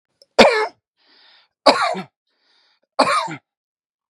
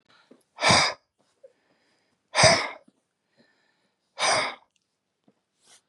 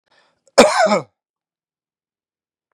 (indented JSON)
{
  "three_cough_length": "4.1 s",
  "three_cough_amplitude": 32768,
  "three_cough_signal_mean_std_ratio": 0.34,
  "exhalation_length": "5.9 s",
  "exhalation_amplitude": 24387,
  "exhalation_signal_mean_std_ratio": 0.31,
  "cough_length": "2.7 s",
  "cough_amplitude": 32768,
  "cough_signal_mean_std_ratio": 0.29,
  "survey_phase": "beta (2021-08-13 to 2022-03-07)",
  "age": "45-64",
  "gender": "Male",
  "wearing_mask": "No",
  "symptom_none": true,
  "symptom_onset": "13 days",
  "smoker_status": "Ex-smoker",
  "respiratory_condition_asthma": false,
  "respiratory_condition_other": false,
  "recruitment_source": "REACT",
  "submission_delay": "0 days",
  "covid_test_result": "Negative",
  "covid_test_method": "RT-qPCR",
  "influenza_a_test_result": "Negative",
  "influenza_b_test_result": "Negative"
}